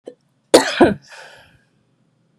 {"cough_length": "2.4 s", "cough_amplitude": 32768, "cough_signal_mean_std_ratio": 0.28, "survey_phase": "beta (2021-08-13 to 2022-03-07)", "age": "45-64", "gender": "Female", "wearing_mask": "No", "symptom_cough_any": true, "symptom_runny_or_blocked_nose": true, "symptom_sore_throat": true, "symptom_abdominal_pain": true, "symptom_diarrhoea": true, "symptom_fatigue": true, "symptom_headache": true, "symptom_change_to_sense_of_smell_or_taste": true, "symptom_loss_of_taste": true, "symptom_other": true, "symptom_onset": "4 days", "smoker_status": "Ex-smoker", "respiratory_condition_asthma": true, "respiratory_condition_other": false, "recruitment_source": "Test and Trace", "submission_delay": "2 days", "covid_test_result": "Positive", "covid_test_method": "RT-qPCR", "covid_ct_value": 20.9, "covid_ct_gene": "S gene"}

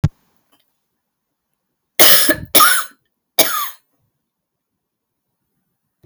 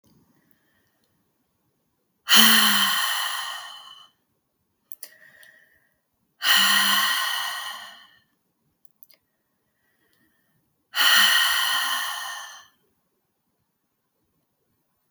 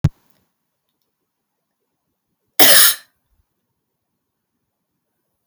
{"three_cough_length": "6.1 s", "three_cough_amplitude": 32768, "three_cough_signal_mean_std_ratio": 0.3, "exhalation_length": "15.1 s", "exhalation_amplitude": 32768, "exhalation_signal_mean_std_ratio": 0.39, "cough_length": "5.5 s", "cough_amplitude": 32768, "cough_signal_mean_std_ratio": 0.21, "survey_phase": "beta (2021-08-13 to 2022-03-07)", "age": "45-64", "gender": "Female", "wearing_mask": "No", "symptom_cough_any": true, "symptom_runny_or_blocked_nose": true, "symptom_fatigue": true, "symptom_change_to_sense_of_smell_or_taste": true, "symptom_other": true, "symptom_onset": "6 days", "smoker_status": "Never smoked", "respiratory_condition_asthma": false, "respiratory_condition_other": false, "recruitment_source": "Test and Trace", "submission_delay": "1 day", "covid_test_result": "Positive", "covid_test_method": "RT-qPCR", "covid_ct_value": 18.1, "covid_ct_gene": "ORF1ab gene", "covid_ct_mean": 19.3, "covid_viral_load": "460000 copies/ml", "covid_viral_load_category": "Low viral load (10K-1M copies/ml)"}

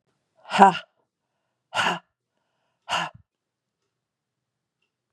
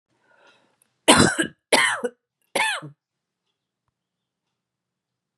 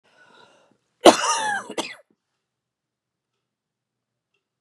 {"exhalation_length": "5.1 s", "exhalation_amplitude": 32767, "exhalation_signal_mean_std_ratio": 0.22, "three_cough_length": "5.4 s", "three_cough_amplitude": 31635, "three_cough_signal_mean_std_ratio": 0.29, "cough_length": "4.6 s", "cough_amplitude": 32768, "cough_signal_mean_std_ratio": 0.21, "survey_phase": "beta (2021-08-13 to 2022-03-07)", "age": "45-64", "gender": "Female", "wearing_mask": "No", "symptom_none": true, "symptom_onset": "6 days", "smoker_status": "Never smoked", "respiratory_condition_asthma": false, "respiratory_condition_other": false, "recruitment_source": "REACT", "submission_delay": "3 days", "covid_test_result": "Negative", "covid_test_method": "RT-qPCR", "influenza_a_test_result": "Negative", "influenza_b_test_result": "Negative"}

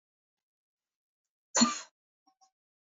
{"cough_length": "2.8 s", "cough_amplitude": 10125, "cough_signal_mean_std_ratio": 0.2, "survey_phase": "beta (2021-08-13 to 2022-03-07)", "age": "18-44", "gender": "Female", "wearing_mask": "No", "symptom_none": true, "smoker_status": "Never smoked", "respiratory_condition_asthma": false, "respiratory_condition_other": false, "recruitment_source": "REACT", "submission_delay": "2 days", "covid_test_result": "Negative", "covid_test_method": "RT-qPCR", "influenza_a_test_result": "Unknown/Void", "influenza_b_test_result": "Unknown/Void"}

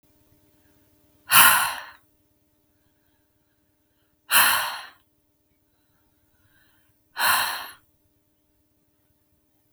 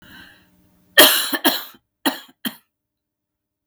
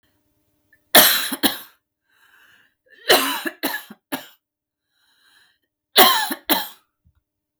{"exhalation_length": "9.7 s", "exhalation_amplitude": 32768, "exhalation_signal_mean_std_ratio": 0.27, "cough_length": "3.7 s", "cough_amplitude": 32768, "cough_signal_mean_std_ratio": 0.3, "three_cough_length": "7.6 s", "three_cough_amplitude": 32768, "three_cough_signal_mean_std_ratio": 0.32, "survey_phase": "beta (2021-08-13 to 2022-03-07)", "age": "18-44", "gender": "Female", "wearing_mask": "No", "symptom_none": true, "smoker_status": "Never smoked", "respiratory_condition_asthma": true, "respiratory_condition_other": false, "recruitment_source": "REACT", "submission_delay": "1 day", "covid_test_result": "Negative", "covid_test_method": "RT-qPCR", "influenza_a_test_result": "Negative", "influenza_b_test_result": "Negative"}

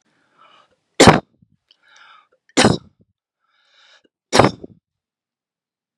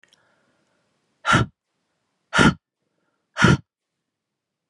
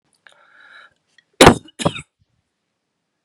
{"three_cough_length": "6.0 s", "three_cough_amplitude": 32768, "three_cough_signal_mean_std_ratio": 0.22, "exhalation_length": "4.7 s", "exhalation_amplitude": 29236, "exhalation_signal_mean_std_ratio": 0.27, "cough_length": "3.2 s", "cough_amplitude": 32768, "cough_signal_mean_std_ratio": 0.2, "survey_phase": "beta (2021-08-13 to 2022-03-07)", "age": "18-44", "gender": "Female", "wearing_mask": "No", "symptom_runny_or_blocked_nose": true, "symptom_fatigue": true, "symptom_change_to_sense_of_smell_or_taste": true, "symptom_other": true, "symptom_onset": "2 days", "smoker_status": "Never smoked", "respiratory_condition_asthma": false, "respiratory_condition_other": false, "recruitment_source": "Test and Trace", "submission_delay": "2 days", "covid_test_result": "Positive", "covid_test_method": "RT-qPCR", "covid_ct_value": 27.9, "covid_ct_gene": "ORF1ab gene"}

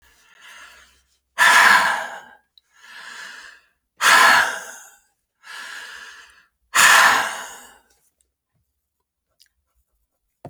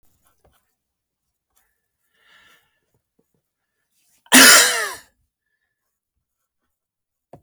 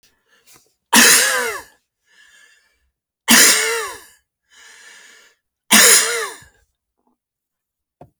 {"exhalation_length": "10.5 s", "exhalation_amplitude": 32768, "exhalation_signal_mean_std_ratio": 0.36, "cough_length": "7.4 s", "cough_amplitude": 32768, "cough_signal_mean_std_ratio": 0.2, "three_cough_length": "8.2 s", "three_cough_amplitude": 32768, "three_cough_signal_mean_std_ratio": 0.36, "survey_phase": "beta (2021-08-13 to 2022-03-07)", "age": "65+", "gender": "Male", "wearing_mask": "No", "symptom_none": true, "smoker_status": "Ex-smoker", "respiratory_condition_asthma": false, "respiratory_condition_other": false, "recruitment_source": "REACT", "submission_delay": "2 days", "covid_test_result": "Negative", "covid_test_method": "RT-qPCR"}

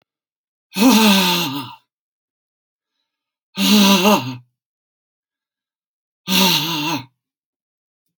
{"exhalation_length": "8.2 s", "exhalation_amplitude": 32510, "exhalation_signal_mean_std_ratio": 0.43, "survey_phase": "alpha (2021-03-01 to 2021-08-12)", "age": "65+", "gender": "Male", "wearing_mask": "No", "symptom_none": true, "smoker_status": "Never smoked", "respiratory_condition_asthma": false, "respiratory_condition_other": false, "recruitment_source": "REACT", "submission_delay": "1 day", "covid_test_result": "Negative", "covid_test_method": "RT-qPCR"}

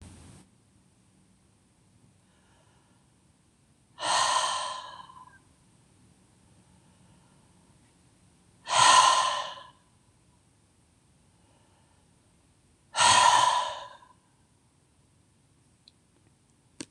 {"exhalation_length": "16.9 s", "exhalation_amplitude": 14281, "exhalation_signal_mean_std_ratio": 0.3, "survey_phase": "beta (2021-08-13 to 2022-03-07)", "age": "45-64", "gender": "Male", "wearing_mask": "No", "symptom_cough_any": true, "symptom_runny_or_blocked_nose": true, "symptom_headache": true, "smoker_status": "Never smoked", "respiratory_condition_asthma": false, "respiratory_condition_other": false, "recruitment_source": "Test and Trace", "submission_delay": "1 day", "covid_test_result": "Positive", "covid_test_method": "RT-qPCR"}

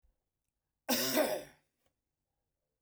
{"cough_length": "2.8 s", "cough_amplitude": 5119, "cough_signal_mean_std_ratio": 0.35, "survey_phase": "beta (2021-08-13 to 2022-03-07)", "age": "45-64", "gender": "Male", "wearing_mask": "No", "symptom_none": true, "smoker_status": "Never smoked", "respiratory_condition_asthma": false, "respiratory_condition_other": false, "recruitment_source": "REACT", "submission_delay": "1 day", "covid_test_result": "Negative", "covid_test_method": "RT-qPCR"}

